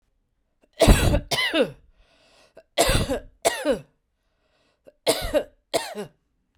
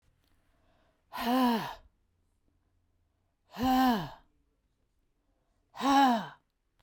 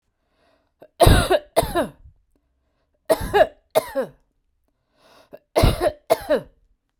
{"cough_length": "6.6 s", "cough_amplitude": 29270, "cough_signal_mean_std_ratio": 0.41, "exhalation_length": "6.8 s", "exhalation_amplitude": 8679, "exhalation_signal_mean_std_ratio": 0.38, "three_cough_length": "7.0 s", "three_cough_amplitude": 32768, "three_cough_signal_mean_std_ratio": 0.36, "survey_phase": "beta (2021-08-13 to 2022-03-07)", "age": "45-64", "gender": "Female", "wearing_mask": "No", "symptom_none": true, "smoker_status": "Never smoked", "respiratory_condition_asthma": false, "respiratory_condition_other": false, "recruitment_source": "REACT", "submission_delay": "6 days", "covid_test_result": "Negative", "covid_test_method": "RT-qPCR", "influenza_a_test_result": "Negative", "influenza_b_test_result": "Negative"}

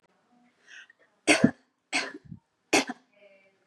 {"three_cough_length": "3.7 s", "three_cough_amplitude": 18438, "three_cough_signal_mean_std_ratio": 0.27, "survey_phase": "beta (2021-08-13 to 2022-03-07)", "age": "18-44", "gender": "Female", "wearing_mask": "No", "symptom_none": true, "smoker_status": "Never smoked", "respiratory_condition_asthma": false, "respiratory_condition_other": false, "recruitment_source": "REACT", "submission_delay": "1 day", "covid_test_result": "Negative", "covid_test_method": "RT-qPCR", "influenza_a_test_result": "Negative", "influenza_b_test_result": "Negative"}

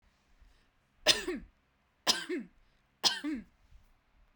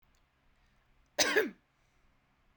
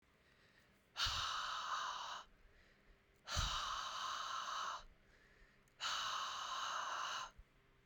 {"three_cough_length": "4.4 s", "three_cough_amplitude": 12829, "three_cough_signal_mean_std_ratio": 0.32, "cough_length": "2.6 s", "cough_amplitude": 8876, "cough_signal_mean_std_ratio": 0.28, "exhalation_length": "7.9 s", "exhalation_amplitude": 1560, "exhalation_signal_mean_std_ratio": 0.73, "survey_phase": "beta (2021-08-13 to 2022-03-07)", "age": "18-44", "gender": "Female", "wearing_mask": "No", "symptom_none": true, "smoker_status": "Never smoked", "respiratory_condition_asthma": false, "respiratory_condition_other": false, "recruitment_source": "REACT", "submission_delay": "10 days", "covid_test_result": "Negative", "covid_test_method": "RT-qPCR"}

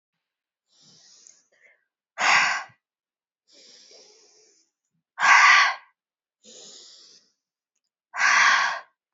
{"exhalation_length": "9.1 s", "exhalation_amplitude": 23145, "exhalation_signal_mean_std_ratio": 0.33, "survey_phase": "alpha (2021-03-01 to 2021-08-12)", "age": "18-44", "gender": "Female", "wearing_mask": "No", "symptom_cough_any": true, "symptom_fatigue": true, "symptom_headache": true, "symptom_change_to_sense_of_smell_or_taste": true, "symptom_loss_of_taste": true, "symptom_onset": "4 days", "smoker_status": "Never smoked", "respiratory_condition_asthma": false, "respiratory_condition_other": false, "recruitment_source": "Test and Trace", "submission_delay": "2 days", "covid_test_result": "Positive", "covid_test_method": "RT-qPCR", "covid_ct_value": 22.8, "covid_ct_gene": "N gene", "covid_ct_mean": 22.9, "covid_viral_load": "30000 copies/ml", "covid_viral_load_category": "Low viral load (10K-1M copies/ml)"}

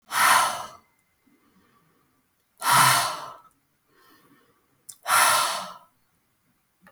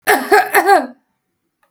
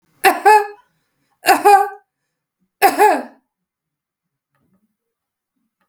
{"exhalation_length": "6.9 s", "exhalation_amplitude": 21171, "exhalation_signal_mean_std_ratio": 0.39, "cough_length": "1.7 s", "cough_amplitude": 32768, "cough_signal_mean_std_ratio": 0.51, "three_cough_length": "5.9 s", "three_cough_amplitude": 32768, "three_cough_signal_mean_std_ratio": 0.33, "survey_phase": "beta (2021-08-13 to 2022-03-07)", "age": "45-64", "gender": "Female", "wearing_mask": "No", "symptom_headache": true, "smoker_status": "Prefer not to say", "respiratory_condition_asthma": false, "respiratory_condition_other": false, "recruitment_source": "REACT", "submission_delay": "0 days", "covid_test_result": "Negative", "covid_test_method": "RT-qPCR", "influenza_a_test_result": "Negative", "influenza_b_test_result": "Negative"}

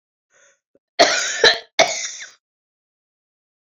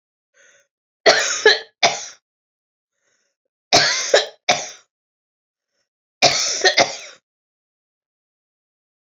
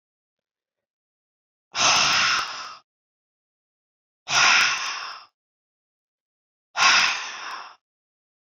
{"cough_length": "3.8 s", "cough_amplitude": 32768, "cough_signal_mean_std_ratio": 0.32, "three_cough_length": "9.0 s", "three_cough_amplitude": 32310, "three_cough_signal_mean_std_ratio": 0.34, "exhalation_length": "8.4 s", "exhalation_amplitude": 19010, "exhalation_signal_mean_std_ratio": 0.4, "survey_phase": "beta (2021-08-13 to 2022-03-07)", "age": "65+", "gender": "Female", "wearing_mask": "No", "symptom_runny_or_blocked_nose": true, "symptom_headache": true, "symptom_onset": "3 days", "smoker_status": "Never smoked", "respiratory_condition_asthma": false, "respiratory_condition_other": false, "recruitment_source": "Test and Trace", "submission_delay": "1 day", "covid_test_result": "Positive", "covid_test_method": "RT-qPCR", "covid_ct_value": 21.4, "covid_ct_gene": "ORF1ab gene", "covid_ct_mean": 22.0, "covid_viral_load": "62000 copies/ml", "covid_viral_load_category": "Low viral load (10K-1M copies/ml)"}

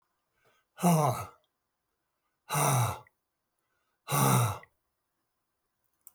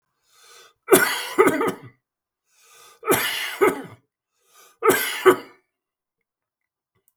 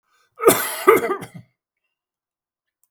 {"exhalation_length": "6.1 s", "exhalation_amplitude": 7646, "exhalation_signal_mean_std_ratio": 0.39, "three_cough_length": "7.2 s", "three_cough_amplitude": 32766, "three_cough_signal_mean_std_ratio": 0.36, "cough_length": "2.9 s", "cough_amplitude": 32768, "cough_signal_mean_std_ratio": 0.32, "survey_phase": "beta (2021-08-13 to 2022-03-07)", "age": "65+", "gender": "Male", "wearing_mask": "No", "symptom_none": true, "smoker_status": "Ex-smoker", "respiratory_condition_asthma": false, "respiratory_condition_other": false, "recruitment_source": "REACT", "submission_delay": "2 days", "covid_test_result": "Negative", "covid_test_method": "RT-qPCR"}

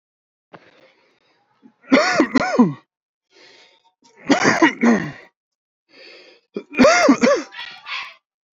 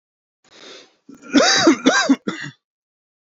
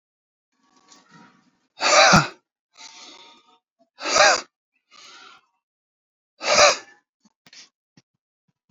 {"three_cough_length": "8.5 s", "three_cough_amplitude": 27148, "three_cough_signal_mean_std_ratio": 0.41, "cough_length": "3.2 s", "cough_amplitude": 28245, "cough_signal_mean_std_ratio": 0.43, "exhalation_length": "8.7 s", "exhalation_amplitude": 27488, "exhalation_signal_mean_std_ratio": 0.29, "survey_phase": "beta (2021-08-13 to 2022-03-07)", "age": "18-44", "gender": "Male", "wearing_mask": "No", "symptom_none": true, "smoker_status": "Current smoker (e-cigarettes or vapes only)", "respiratory_condition_asthma": true, "respiratory_condition_other": false, "recruitment_source": "REACT", "submission_delay": "0 days", "covid_test_result": "Negative", "covid_test_method": "RT-qPCR"}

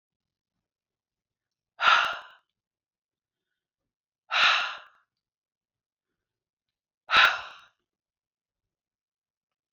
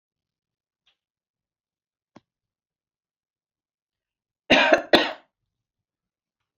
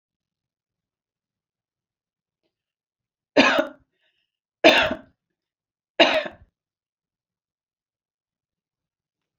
{"exhalation_length": "9.7 s", "exhalation_amplitude": 16578, "exhalation_signal_mean_std_ratio": 0.25, "cough_length": "6.6 s", "cough_amplitude": 26230, "cough_signal_mean_std_ratio": 0.2, "three_cough_length": "9.4 s", "three_cough_amplitude": 32715, "three_cough_signal_mean_std_ratio": 0.22, "survey_phase": "beta (2021-08-13 to 2022-03-07)", "age": "45-64", "gender": "Female", "wearing_mask": "No", "symptom_none": true, "smoker_status": "Never smoked", "respiratory_condition_asthma": false, "respiratory_condition_other": false, "recruitment_source": "REACT", "submission_delay": "1 day", "covid_test_result": "Negative", "covid_test_method": "RT-qPCR"}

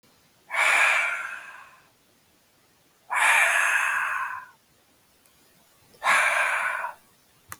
{"exhalation_length": "7.6 s", "exhalation_amplitude": 14957, "exhalation_signal_mean_std_ratio": 0.54, "survey_phase": "beta (2021-08-13 to 2022-03-07)", "age": "18-44", "gender": "Male", "wearing_mask": "No", "symptom_none": true, "symptom_onset": "12 days", "smoker_status": "Never smoked", "respiratory_condition_asthma": false, "respiratory_condition_other": false, "recruitment_source": "REACT", "submission_delay": "2 days", "covid_test_result": "Negative", "covid_test_method": "RT-qPCR", "influenza_a_test_result": "Negative", "influenza_b_test_result": "Negative"}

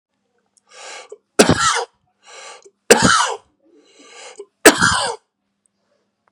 {"three_cough_length": "6.3 s", "three_cough_amplitude": 32768, "three_cough_signal_mean_std_ratio": 0.34, "survey_phase": "beta (2021-08-13 to 2022-03-07)", "age": "45-64", "gender": "Male", "wearing_mask": "No", "symptom_runny_or_blocked_nose": true, "symptom_fatigue": true, "symptom_onset": "12 days", "smoker_status": "Never smoked", "respiratory_condition_asthma": false, "respiratory_condition_other": false, "recruitment_source": "REACT", "submission_delay": "2 days", "covid_test_result": "Negative", "covid_test_method": "RT-qPCR", "influenza_a_test_result": "Negative", "influenza_b_test_result": "Negative"}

